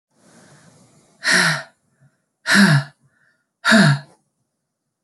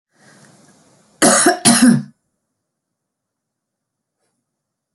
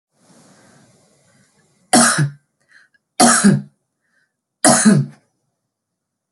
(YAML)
exhalation_length: 5.0 s
exhalation_amplitude: 27116
exhalation_signal_mean_std_ratio: 0.38
cough_length: 4.9 s
cough_amplitude: 32768
cough_signal_mean_std_ratio: 0.31
three_cough_length: 6.3 s
three_cough_amplitude: 32768
three_cough_signal_mean_std_ratio: 0.35
survey_phase: beta (2021-08-13 to 2022-03-07)
age: 18-44
gender: Female
wearing_mask: 'No'
symptom_none: true
symptom_onset: 12 days
smoker_status: Never smoked
respiratory_condition_asthma: true
respiratory_condition_other: false
recruitment_source: REACT
submission_delay: 2 days
covid_test_result: Negative
covid_test_method: RT-qPCR
influenza_a_test_result: Negative
influenza_b_test_result: Negative